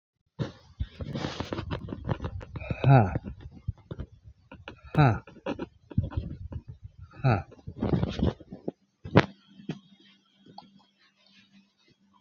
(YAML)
exhalation_length: 12.2 s
exhalation_amplitude: 26006
exhalation_signal_mean_std_ratio: 0.37
survey_phase: beta (2021-08-13 to 2022-03-07)
age: 65+
gender: Male
wearing_mask: 'No'
symptom_runny_or_blocked_nose: true
symptom_onset: 12 days
smoker_status: Current smoker (1 to 10 cigarettes per day)
respiratory_condition_asthma: false
respiratory_condition_other: false
recruitment_source: REACT
submission_delay: 2 days
covid_test_result: Negative
covid_test_method: RT-qPCR